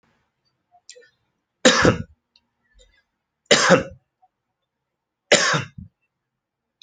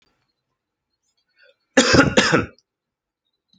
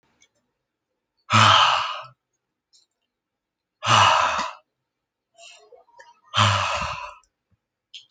three_cough_length: 6.8 s
three_cough_amplitude: 29857
three_cough_signal_mean_std_ratio: 0.28
cough_length: 3.6 s
cough_amplitude: 30963
cough_signal_mean_std_ratio: 0.31
exhalation_length: 8.1 s
exhalation_amplitude: 27247
exhalation_signal_mean_std_ratio: 0.38
survey_phase: beta (2021-08-13 to 2022-03-07)
age: 18-44
gender: Male
wearing_mask: 'No'
symptom_runny_or_blocked_nose: true
symptom_sore_throat: true
smoker_status: Never smoked
respiratory_condition_asthma: false
respiratory_condition_other: false
recruitment_source: Test and Trace
submission_delay: -1 day
covid_test_result: Negative
covid_test_method: LFT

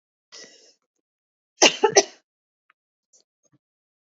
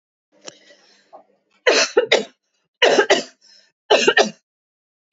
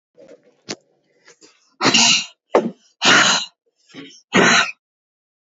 cough_length: 4.1 s
cough_amplitude: 32768
cough_signal_mean_std_ratio: 0.19
three_cough_length: 5.1 s
three_cough_amplitude: 29526
three_cough_signal_mean_std_ratio: 0.37
exhalation_length: 5.5 s
exhalation_amplitude: 32767
exhalation_signal_mean_std_ratio: 0.41
survey_phase: beta (2021-08-13 to 2022-03-07)
age: 18-44
gender: Female
wearing_mask: 'No'
symptom_none: true
smoker_status: Ex-smoker
respiratory_condition_asthma: false
respiratory_condition_other: false
recruitment_source: REACT
submission_delay: 3 days
covid_test_result: Negative
covid_test_method: RT-qPCR
influenza_a_test_result: Unknown/Void
influenza_b_test_result: Unknown/Void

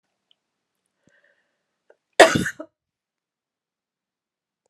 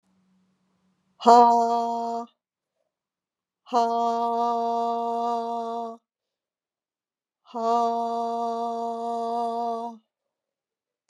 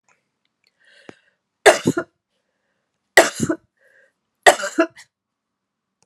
cough_length: 4.7 s
cough_amplitude: 32768
cough_signal_mean_std_ratio: 0.15
exhalation_length: 11.1 s
exhalation_amplitude: 26137
exhalation_signal_mean_std_ratio: 0.48
three_cough_length: 6.1 s
three_cough_amplitude: 32768
three_cough_signal_mean_std_ratio: 0.23
survey_phase: beta (2021-08-13 to 2022-03-07)
age: 45-64
gender: Female
wearing_mask: 'No'
symptom_cough_any: true
symptom_runny_or_blocked_nose: true
symptom_fatigue: true
symptom_fever_high_temperature: true
symptom_onset: 3 days
smoker_status: Never smoked
respiratory_condition_asthma: false
respiratory_condition_other: false
recruitment_source: Test and Trace
submission_delay: 2 days
covid_test_result: Positive
covid_test_method: RT-qPCR
covid_ct_value: 15.1
covid_ct_gene: ORF1ab gene
covid_ct_mean: 15.6
covid_viral_load: 7700000 copies/ml
covid_viral_load_category: High viral load (>1M copies/ml)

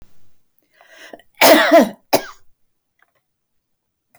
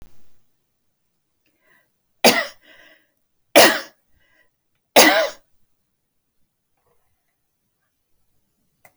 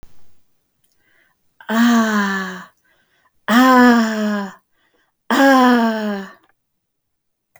cough_length: 4.2 s
cough_amplitude: 32767
cough_signal_mean_std_ratio: 0.31
three_cough_length: 9.0 s
three_cough_amplitude: 32768
three_cough_signal_mean_std_ratio: 0.23
exhalation_length: 7.6 s
exhalation_amplitude: 28283
exhalation_signal_mean_std_ratio: 0.52
survey_phase: beta (2021-08-13 to 2022-03-07)
age: 65+
gender: Female
wearing_mask: 'No'
symptom_none: true
smoker_status: Never smoked
respiratory_condition_asthma: false
respiratory_condition_other: false
recruitment_source: REACT
submission_delay: 2 days
covid_test_result: Negative
covid_test_method: RT-qPCR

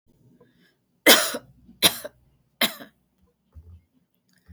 three_cough_length: 4.5 s
three_cough_amplitude: 32549
three_cough_signal_mean_std_ratio: 0.24
survey_phase: beta (2021-08-13 to 2022-03-07)
age: 45-64
gender: Female
wearing_mask: 'No'
symptom_cough_any: true
symptom_runny_or_blocked_nose: true
symptom_sore_throat: true
symptom_headache: true
symptom_other: true
symptom_onset: 3 days
smoker_status: Never smoked
respiratory_condition_asthma: false
respiratory_condition_other: false
recruitment_source: Test and Trace
submission_delay: 1 day
covid_test_result: Positive
covid_test_method: RT-qPCR
covid_ct_value: 17.3
covid_ct_gene: ORF1ab gene
covid_ct_mean: 17.7
covid_viral_load: 1500000 copies/ml
covid_viral_load_category: High viral load (>1M copies/ml)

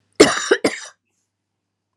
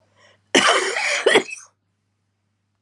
three_cough_length: 2.0 s
three_cough_amplitude: 32768
three_cough_signal_mean_std_ratio: 0.31
cough_length: 2.8 s
cough_amplitude: 31387
cough_signal_mean_std_ratio: 0.43
survey_phase: alpha (2021-03-01 to 2021-08-12)
age: 45-64
gender: Female
wearing_mask: 'No'
symptom_cough_any: true
symptom_fatigue: true
symptom_fever_high_temperature: true
symptom_headache: true
symptom_onset: 6 days
smoker_status: Ex-smoker
respiratory_condition_asthma: false
respiratory_condition_other: false
recruitment_source: Test and Trace
submission_delay: 2 days
covid_test_result: Positive
covid_test_method: RT-qPCR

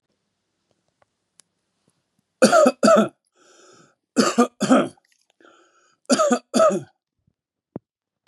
three_cough_length: 8.3 s
three_cough_amplitude: 29851
three_cough_signal_mean_std_ratio: 0.35
survey_phase: beta (2021-08-13 to 2022-03-07)
age: 65+
gender: Male
wearing_mask: 'No'
symptom_none: true
smoker_status: Never smoked
respiratory_condition_asthma: false
respiratory_condition_other: false
recruitment_source: REACT
submission_delay: 2 days
covid_test_result: Negative
covid_test_method: RT-qPCR
influenza_a_test_result: Negative
influenza_b_test_result: Negative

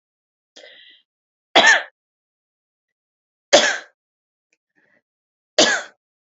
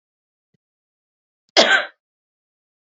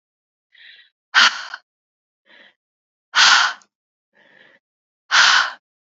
three_cough_length: 6.4 s
three_cough_amplitude: 32767
three_cough_signal_mean_std_ratio: 0.25
cough_length: 2.9 s
cough_amplitude: 29610
cough_signal_mean_std_ratio: 0.23
exhalation_length: 6.0 s
exhalation_amplitude: 32767
exhalation_signal_mean_std_ratio: 0.33
survey_phase: alpha (2021-03-01 to 2021-08-12)
age: 18-44
gender: Female
wearing_mask: 'No'
symptom_shortness_of_breath: true
symptom_change_to_sense_of_smell_or_taste: true
symptom_onset: 4 days
smoker_status: Current smoker (e-cigarettes or vapes only)
respiratory_condition_asthma: false
respiratory_condition_other: false
recruitment_source: Test and Trace
submission_delay: 2 days
covid_test_result: Positive
covid_test_method: RT-qPCR
covid_ct_value: 17.2
covid_ct_gene: ORF1ab gene
covid_ct_mean: 17.4
covid_viral_load: 2000000 copies/ml
covid_viral_load_category: High viral load (>1M copies/ml)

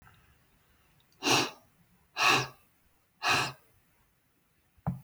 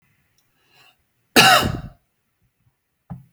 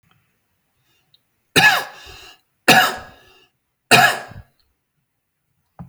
exhalation_length: 5.0 s
exhalation_amplitude: 9036
exhalation_signal_mean_std_ratio: 0.35
cough_length: 3.3 s
cough_amplitude: 32767
cough_signal_mean_std_ratio: 0.27
three_cough_length: 5.9 s
three_cough_amplitude: 32743
three_cough_signal_mean_std_ratio: 0.3
survey_phase: alpha (2021-03-01 to 2021-08-12)
age: 65+
gender: Male
wearing_mask: 'No'
symptom_none: true
smoker_status: Ex-smoker
respiratory_condition_asthma: false
respiratory_condition_other: false
recruitment_source: REACT
submission_delay: 2 days
covid_test_result: Negative
covid_test_method: RT-qPCR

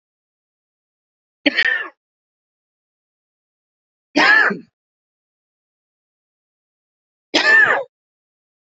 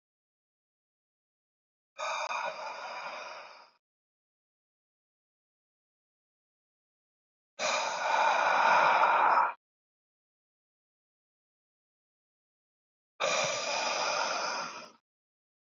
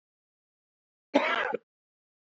three_cough_length: 8.8 s
three_cough_amplitude: 31289
three_cough_signal_mean_std_ratio: 0.29
exhalation_length: 15.7 s
exhalation_amplitude: 7883
exhalation_signal_mean_std_ratio: 0.41
cough_length: 2.4 s
cough_amplitude: 13403
cough_signal_mean_std_ratio: 0.3
survey_phase: beta (2021-08-13 to 2022-03-07)
age: 18-44
gender: Male
wearing_mask: 'No'
symptom_cough_any: true
symptom_runny_or_blocked_nose: true
symptom_sore_throat: true
symptom_onset: 3 days
smoker_status: Current smoker (e-cigarettes or vapes only)
respiratory_condition_asthma: false
respiratory_condition_other: false
recruitment_source: Test and Trace
submission_delay: 2 days
covid_test_result: Positive
covid_test_method: RT-qPCR
covid_ct_value: 17.1
covid_ct_gene: S gene
covid_ct_mean: 17.3
covid_viral_load: 2100000 copies/ml
covid_viral_load_category: High viral load (>1M copies/ml)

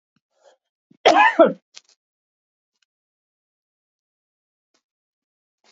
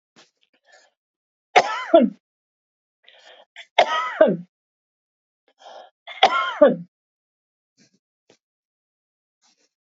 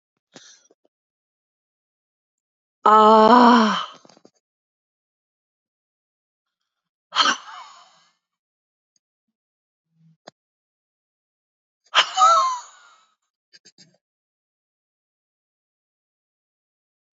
cough_length: 5.7 s
cough_amplitude: 27944
cough_signal_mean_std_ratio: 0.21
three_cough_length: 9.9 s
three_cough_amplitude: 32768
three_cough_signal_mean_std_ratio: 0.26
exhalation_length: 17.2 s
exhalation_amplitude: 28533
exhalation_signal_mean_std_ratio: 0.24
survey_phase: beta (2021-08-13 to 2022-03-07)
age: 65+
gender: Female
wearing_mask: 'No'
symptom_none: true
symptom_onset: 12 days
smoker_status: Never smoked
respiratory_condition_asthma: false
respiratory_condition_other: false
recruitment_source: REACT
submission_delay: 2 days
covid_test_result: Negative
covid_test_method: RT-qPCR
influenza_a_test_result: Negative
influenza_b_test_result: Negative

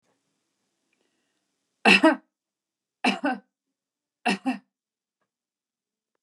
three_cough_length: 6.2 s
three_cough_amplitude: 21793
three_cough_signal_mean_std_ratio: 0.24
survey_phase: beta (2021-08-13 to 2022-03-07)
age: 45-64
gender: Female
wearing_mask: 'No'
symptom_none: true
smoker_status: Ex-smoker
respiratory_condition_asthma: false
respiratory_condition_other: false
recruitment_source: REACT
submission_delay: 1 day
covid_test_result: Negative
covid_test_method: RT-qPCR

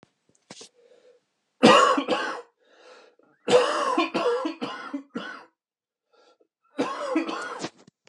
three_cough_length: 8.1 s
three_cough_amplitude: 25597
three_cough_signal_mean_std_ratio: 0.42
survey_phase: beta (2021-08-13 to 2022-03-07)
age: 45-64
gender: Male
wearing_mask: 'No'
symptom_none: true
smoker_status: Ex-smoker
respiratory_condition_asthma: false
respiratory_condition_other: false
recruitment_source: REACT
submission_delay: 4 days
covid_test_result: Negative
covid_test_method: RT-qPCR
influenza_a_test_result: Negative
influenza_b_test_result: Negative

